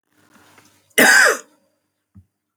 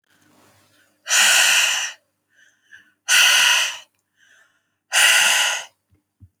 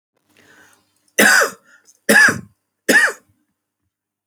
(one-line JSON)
{"cough_length": "2.6 s", "cough_amplitude": 30810, "cough_signal_mean_std_ratio": 0.33, "exhalation_length": "6.4 s", "exhalation_amplitude": 25687, "exhalation_signal_mean_std_ratio": 0.5, "three_cough_length": "4.3 s", "three_cough_amplitude": 32768, "three_cough_signal_mean_std_ratio": 0.37, "survey_phase": "alpha (2021-03-01 to 2021-08-12)", "age": "18-44", "gender": "Female", "wearing_mask": "No", "symptom_none": true, "symptom_onset": "6 days", "smoker_status": "Never smoked", "respiratory_condition_asthma": false, "respiratory_condition_other": false, "recruitment_source": "REACT", "submission_delay": "2 days", "covid_test_result": "Negative", "covid_test_method": "RT-qPCR"}